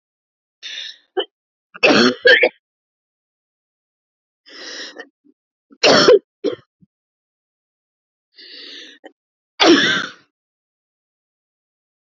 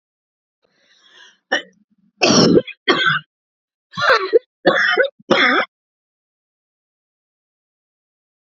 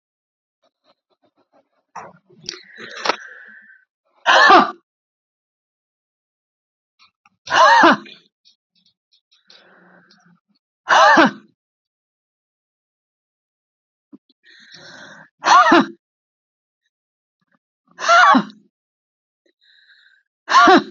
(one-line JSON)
{"three_cough_length": "12.1 s", "three_cough_amplitude": 31327, "three_cough_signal_mean_std_ratio": 0.3, "cough_length": "8.4 s", "cough_amplitude": 30327, "cough_signal_mean_std_ratio": 0.38, "exhalation_length": "20.9 s", "exhalation_amplitude": 29958, "exhalation_signal_mean_std_ratio": 0.29, "survey_phase": "beta (2021-08-13 to 2022-03-07)", "age": "45-64", "gender": "Female", "wearing_mask": "No", "symptom_cough_any": true, "symptom_runny_or_blocked_nose": true, "symptom_change_to_sense_of_smell_or_taste": true, "symptom_onset": "12 days", "smoker_status": "Ex-smoker", "respiratory_condition_asthma": false, "respiratory_condition_other": false, "recruitment_source": "REACT", "submission_delay": "0 days", "covid_test_result": "Negative", "covid_test_method": "RT-qPCR"}